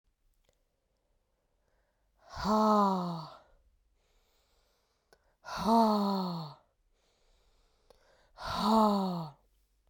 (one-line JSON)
{"exhalation_length": "9.9 s", "exhalation_amplitude": 7175, "exhalation_signal_mean_std_ratio": 0.41, "survey_phase": "beta (2021-08-13 to 2022-03-07)", "age": "18-44", "gender": "Female", "wearing_mask": "No", "symptom_cough_any": true, "symptom_runny_or_blocked_nose": true, "symptom_fatigue": true, "symptom_headache": true, "symptom_other": true, "smoker_status": "Never smoked", "respiratory_condition_asthma": false, "respiratory_condition_other": false, "recruitment_source": "Test and Trace", "submission_delay": "1 day", "covid_test_result": "Positive", "covid_test_method": "RT-qPCR", "covid_ct_value": 20.6, "covid_ct_gene": "ORF1ab gene", "covid_ct_mean": 21.5, "covid_viral_load": "89000 copies/ml", "covid_viral_load_category": "Low viral load (10K-1M copies/ml)"}